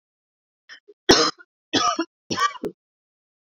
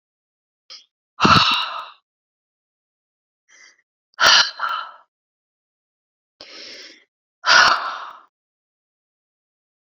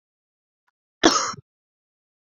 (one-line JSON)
{"three_cough_length": "3.5 s", "three_cough_amplitude": 29323, "three_cough_signal_mean_std_ratio": 0.34, "exhalation_length": "9.8 s", "exhalation_amplitude": 32767, "exhalation_signal_mean_std_ratio": 0.3, "cough_length": "2.4 s", "cough_amplitude": 28933, "cough_signal_mean_std_ratio": 0.23, "survey_phase": "beta (2021-08-13 to 2022-03-07)", "age": "45-64", "gender": "Female", "wearing_mask": "No", "symptom_runny_or_blocked_nose": true, "symptom_abdominal_pain": true, "symptom_fatigue": true, "symptom_headache": true, "symptom_change_to_sense_of_smell_or_taste": true, "symptom_loss_of_taste": true, "smoker_status": "Never smoked", "respiratory_condition_asthma": false, "respiratory_condition_other": false, "recruitment_source": "Test and Trace", "submission_delay": "2 days", "covid_test_result": "Positive", "covid_test_method": "RT-qPCR", "covid_ct_value": 24.0, "covid_ct_gene": "ORF1ab gene", "covid_ct_mean": 24.9, "covid_viral_load": "6600 copies/ml", "covid_viral_load_category": "Minimal viral load (< 10K copies/ml)"}